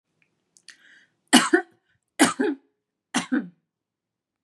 {
  "three_cough_length": "4.4 s",
  "three_cough_amplitude": 32278,
  "three_cough_signal_mean_std_ratio": 0.29,
  "survey_phase": "beta (2021-08-13 to 2022-03-07)",
  "age": "45-64",
  "gender": "Female",
  "wearing_mask": "No",
  "symptom_none": true,
  "smoker_status": "Ex-smoker",
  "respiratory_condition_asthma": false,
  "respiratory_condition_other": false,
  "recruitment_source": "Test and Trace",
  "submission_delay": "4 days",
  "covid_test_result": "Negative",
  "covid_test_method": "RT-qPCR"
}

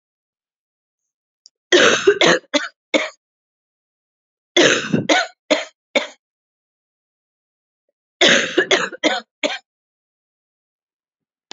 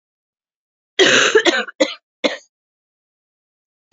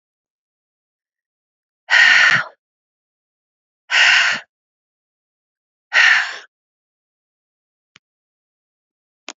{
  "three_cough_length": "11.5 s",
  "three_cough_amplitude": 32768,
  "three_cough_signal_mean_std_ratio": 0.35,
  "cough_length": "3.9 s",
  "cough_amplitude": 31304,
  "cough_signal_mean_std_ratio": 0.35,
  "exhalation_length": "9.4 s",
  "exhalation_amplitude": 30760,
  "exhalation_signal_mean_std_ratio": 0.31,
  "survey_phase": "beta (2021-08-13 to 2022-03-07)",
  "age": "45-64",
  "gender": "Female",
  "wearing_mask": "No",
  "symptom_cough_any": true,
  "symptom_runny_or_blocked_nose": true,
  "symptom_sore_throat": true,
  "symptom_headache": true,
  "smoker_status": "Never smoked",
  "respiratory_condition_asthma": false,
  "respiratory_condition_other": false,
  "recruitment_source": "Test and Trace",
  "submission_delay": "2 days",
  "covid_test_result": "Negative",
  "covid_test_method": "ePCR"
}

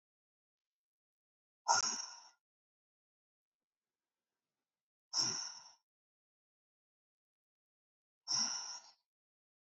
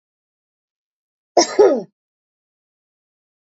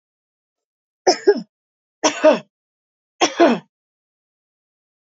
{
  "exhalation_length": "9.6 s",
  "exhalation_amplitude": 4438,
  "exhalation_signal_mean_std_ratio": 0.26,
  "cough_length": "3.4 s",
  "cough_amplitude": 27066,
  "cough_signal_mean_std_ratio": 0.24,
  "three_cough_length": "5.1 s",
  "three_cough_amplitude": 27799,
  "three_cough_signal_mean_std_ratio": 0.29,
  "survey_phase": "beta (2021-08-13 to 2022-03-07)",
  "age": "45-64",
  "gender": "Female",
  "wearing_mask": "No",
  "symptom_fatigue": true,
  "symptom_headache": true,
  "symptom_change_to_sense_of_smell_or_taste": true,
  "symptom_onset": "3 days",
  "smoker_status": "Never smoked",
  "respiratory_condition_asthma": false,
  "respiratory_condition_other": false,
  "recruitment_source": "Test and Trace",
  "submission_delay": "2 days",
  "covid_test_result": "Positive",
  "covid_test_method": "RT-qPCR",
  "covid_ct_value": 34.1,
  "covid_ct_gene": "S gene"
}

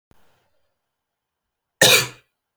{
  "cough_length": "2.6 s",
  "cough_amplitude": 32163,
  "cough_signal_mean_std_ratio": 0.24,
  "survey_phase": "alpha (2021-03-01 to 2021-08-12)",
  "age": "18-44",
  "gender": "Male",
  "wearing_mask": "No",
  "symptom_fatigue": true,
  "smoker_status": "Current smoker (e-cigarettes or vapes only)",
  "respiratory_condition_asthma": false,
  "respiratory_condition_other": false,
  "recruitment_source": "Test and Trace",
  "submission_delay": "1 day",
  "covid_test_result": "Positive",
  "covid_test_method": "RT-qPCR",
  "covid_ct_value": 23.3,
  "covid_ct_gene": "ORF1ab gene",
  "covid_ct_mean": 23.9,
  "covid_viral_load": "15000 copies/ml",
  "covid_viral_load_category": "Low viral load (10K-1M copies/ml)"
}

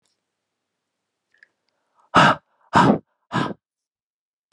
{
  "exhalation_length": "4.5 s",
  "exhalation_amplitude": 29274,
  "exhalation_signal_mean_std_ratio": 0.28,
  "survey_phase": "beta (2021-08-13 to 2022-03-07)",
  "age": "45-64",
  "gender": "Male",
  "wearing_mask": "No",
  "symptom_cough_any": true,
  "symptom_runny_or_blocked_nose": true,
  "symptom_sore_throat": true,
  "symptom_change_to_sense_of_smell_or_taste": true,
  "symptom_loss_of_taste": true,
  "symptom_onset": "5 days",
  "smoker_status": "Ex-smoker",
  "respiratory_condition_asthma": false,
  "respiratory_condition_other": false,
  "recruitment_source": "Test and Trace",
  "submission_delay": "2 days",
  "covid_test_result": "Positive",
  "covid_test_method": "ePCR"
}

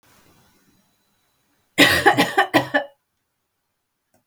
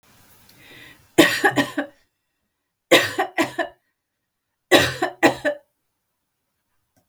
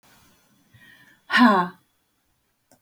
{
  "cough_length": "4.3 s",
  "cough_amplitude": 32768,
  "cough_signal_mean_std_ratio": 0.33,
  "three_cough_length": "7.1 s",
  "three_cough_amplitude": 32768,
  "three_cough_signal_mean_std_ratio": 0.33,
  "exhalation_length": "2.8 s",
  "exhalation_amplitude": 23411,
  "exhalation_signal_mean_std_ratio": 0.29,
  "survey_phase": "beta (2021-08-13 to 2022-03-07)",
  "age": "65+",
  "gender": "Female",
  "wearing_mask": "No",
  "symptom_none": true,
  "smoker_status": "Ex-smoker",
  "respiratory_condition_asthma": false,
  "respiratory_condition_other": false,
  "recruitment_source": "REACT",
  "submission_delay": "3 days",
  "covid_test_result": "Negative",
  "covid_test_method": "RT-qPCR",
  "influenza_a_test_result": "Negative",
  "influenza_b_test_result": "Negative"
}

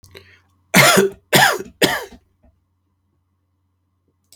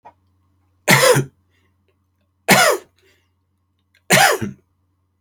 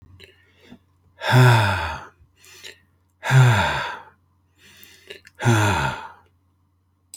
{
  "cough_length": "4.4 s",
  "cough_amplitude": 32768,
  "cough_signal_mean_std_ratio": 0.34,
  "three_cough_length": "5.2 s",
  "three_cough_amplitude": 32768,
  "three_cough_signal_mean_std_ratio": 0.35,
  "exhalation_length": "7.2 s",
  "exhalation_amplitude": 24974,
  "exhalation_signal_mean_std_ratio": 0.42,
  "survey_phase": "alpha (2021-03-01 to 2021-08-12)",
  "age": "45-64",
  "gender": "Male",
  "wearing_mask": "No",
  "symptom_none": true,
  "smoker_status": "Never smoked",
  "respiratory_condition_asthma": false,
  "respiratory_condition_other": false,
  "recruitment_source": "REACT",
  "submission_delay": "1 day",
  "covid_test_result": "Negative",
  "covid_test_method": "RT-qPCR"
}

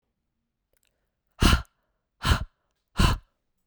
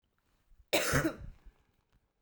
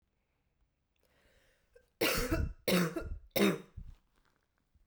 {
  "exhalation_length": "3.7 s",
  "exhalation_amplitude": 17091,
  "exhalation_signal_mean_std_ratio": 0.3,
  "cough_length": "2.2 s",
  "cough_amplitude": 6393,
  "cough_signal_mean_std_ratio": 0.37,
  "three_cough_length": "4.9 s",
  "three_cough_amplitude": 5145,
  "three_cough_signal_mean_std_ratio": 0.4,
  "survey_phase": "beta (2021-08-13 to 2022-03-07)",
  "age": "18-44",
  "gender": "Female",
  "wearing_mask": "No",
  "symptom_cough_any": true,
  "symptom_runny_or_blocked_nose": true,
  "smoker_status": "Never smoked",
  "respiratory_condition_asthma": false,
  "respiratory_condition_other": false,
  "recruitment_source": "Test and Trace",
  "submission_delay": "2 days",
  "covid_test_result": "Positive",
  "covid_test_method": "RT-qPCR"
}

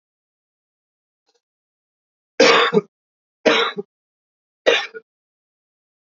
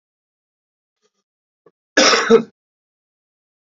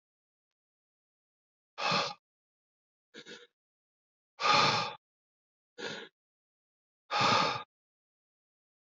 {
  "three_cough_length": "6.1 s",
  "three_cough_amplitude": 29653,
  "three_cough_signal_mean_std_ratio": 0.28,
  "cough_length": "3.8 s",
  "cough_amplitude": 32768,
  "cough_signal_mean_std_ratio": 0.26,
  "exhalation_length": "8.9 s",
  "exhalation_amplitude": 7755,
  "exhalation_signal_mean_std_ratio": 0.32,
  "survey_phase": "beta (2021-08-13 to 2022-03-07)",
  "age": "45-64",
  "gender": "Male",
  "wearing_mask": "No",
  "symptom_cough_any": true,
  "symptom_runny_or_blocked_nose": true,
  "symptom_fatigue": true,
  "smoker_status": "Current smoker (11 or more cigarettes per day)",
  "respiratory_condition_asthma": false,
  "respiratory_condition_other": false,
  "recruitment_source": "Test and Trace",
  "submission_delay": "1 day",
  "covid_test_result": "Negative",
  "covid_test_method": "RT-qPCR"
}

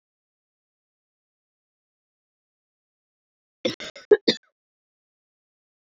{
  "cough_length": "5.8 s",
  "cough_amplitude": 22134,
  "cough_signal_mean_std_ratio": 0.13,
  "survey_phase": "beta (2021-08-13 to 2022-03-07)",
  "age": "45-64",
  "gender": "Female",
  "wearing_mask": "No",
  "symptom_cough_any": true,
  "symptom_new_continuous_cough": true,
  "symptom_runny_or_blocked_nose": true,
  "symptom_shortness_of_breath": true,
  "symptom_sore_throat": true,
  "symptom_fatigue": true,
  "symptom_headache": true,
  "symptom_change_to_sense_of_smell_or_taste": true,
  "symptom_loss_of_taste": true,
  "symptom_onset": "5 days",
  "smoker_status": "Never smoked",
  "respiratory_condition_asthma": false,
  "respiratory_condition_other": false,
  "recruitment_source": "Test and Trace",
  "submission_delay": "1 day",
  "covid_test_result": "Positive",
  "covid_test_method": "RT-qPCR",
  "covid_ct_value": 22.3,
  "covid_ct_gene": "ORF1ab gene",
  "covid_ct_mean": 23.3,
  "covid_viral_load": "23000 copies/ml",
  "covid_viral_load_category": "Low viral load (10K-1M copies/ml)"
}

